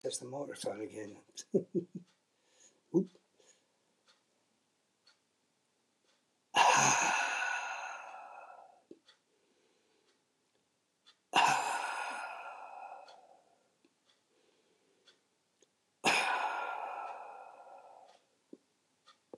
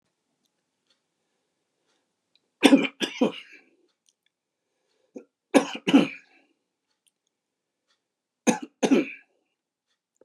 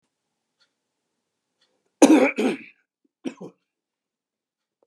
{
  "exhalation_length": "19.4 s",
  "exhalation_amplitude": 7069,
  "exhalation_signal_mean_std_ratio": 0.37,
  "three_cough_length": "10.2 s",
  "three_cough_amplitude": 31951,
  "three_cough_signal_mean_std_ratio": 0.23,
  "cough_length": "4.9 s",
  "cough_amplitude": 31319,
  "cough_signal_mean_std_ratio": 0.24,
  "survey_phase": "beta (2021-08-13 to 2022-03-07)",
  "age": "65+",
  "gender": "Male",
  "wearing_mask": "No",
  "symptom_none": true,
  "smoker_status": "Ex-smoker",
  "respiratory_condition_asthma": false,
  "respiratory_condition_other": true,
  "recruitment_source": "REACT",
  "submission_delay": "2 days",
  "covid_test_result": "Negative",
  "covid_test_method": "RT-qPCR",
  "influenza_a_test_result": "Unknown/Void",
  "influenza_b_test_result": "Unknown/Void"
}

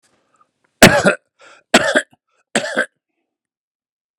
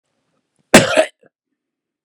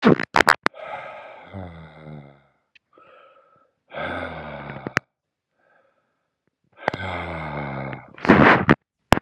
{
  "three_cough_length": "4.2 s",
  "three_cough_amplitude": 32768,
  "three_cough_signal_mean_std_ratio": 0.3,
  "cough_length": "2.0 s",
  "cough_amplitude": 32768,
  "cough_signal_mean_std_ratio": 0.27,
  "exhalation_length": "9.2 s",
  "exhalation_amplitude": 32768,
  "exhalation_signal_mean_std_ratio": 0.31,
  "survey_phase": "beta (2021-08-13 to 2022-03-07)",
  "age": "45-64",
  "gender": "Male",
  "wearing_mask": "No",
  "symptom_shortness_of_breath": true,
  "symptom_abdominal_pain": true,
  "symptom_diarrhoea": true,
  "symptom_fatigue": true,
  "symptom_headache": true,
  "smoker_status": "Current smoker (1 to 10 cigarettes per day)",
  "respiratory_condition_asthma": true,
  "respiratory_condition_other": false,
  "recruitment_source": "REACT",
  "submission_delay": "2 days",
  "covid_test_result": "Negative",
  "covid_test_method": "RT-qPCR",
  "influenza_a_test_result": "Unknown/Void",
  "influenza_b_test_result": "Unknown/Void"
}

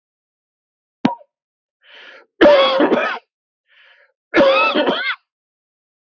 {
  "three_cough_length": "6.1 s",
  "three_cough_amplitude": 32506,
  "three_cough_signal_mean_std_ratio": 0.41,
  "survey_phase": "beta (2021-08-13 to 2022-03-07)",
  "age": "45-64",
  "gender": "Male",
  "wearing_mask": "No",
  "symptom_runny_or_blocked_nose": true,
  "symptom_fatigue": true,
  "symptom_headache": true,
  "smoker_status": "Ex-smoker",
  "respiratory_condition_asthma": false,
  "respiratory_condition_other": false,
  "recruitment_source": "Test and Trace",
  "submission_delay": "1 day",
  "covid_test_result": "Positive",
  "covid_test_method": "RT-qPCR",
  "covid_ct_value": 19.6,
  "covid_ct_gene": "ORF1ab gene"
}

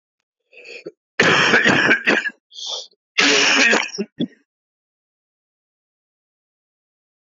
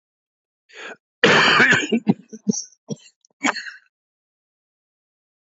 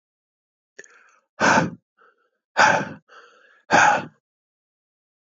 {
  "cough_length": "7.3 s",
  "cough_amplitude": 27315,
  "cough_signal_mean_std_ratio": 0.44,
  "three_cough_length": "5.5 s",
  "three_cough_amplitude": 27189,
  "three_cough_signal_mean_std_ratio": 0.36,
  "exhalation_length": "5.4 s",
  "exhalation_amplitude": 25379,
  "exhalation_signal_mean_std_ratio": 0.33,
  "survey_phase": "beta (2021-08-13 to 2022-03-07)",
  "age": "45-64",
  "gender": "Male",
  "wearing_mask": "No",
  "symptom_cough_any": true,
  "symptom_new_continuous_cough": true,
  "symptom_runny_or_blocked_nose": true,
  "symptom_shortness_of_breath": true,
  "symptom_fatigue": true,
  "symptom_onset": "4 days",
  "smoker_status": "Never smoked",
  "respiratory_condition_asthma": false,
  "respiratory_condition_other": false,
  "recruitment_source": "Test and Trace",
  "submission_delay": "1 day",
  "covid_test_result": "Positive",
  "covid_test_method": "ePCR"
}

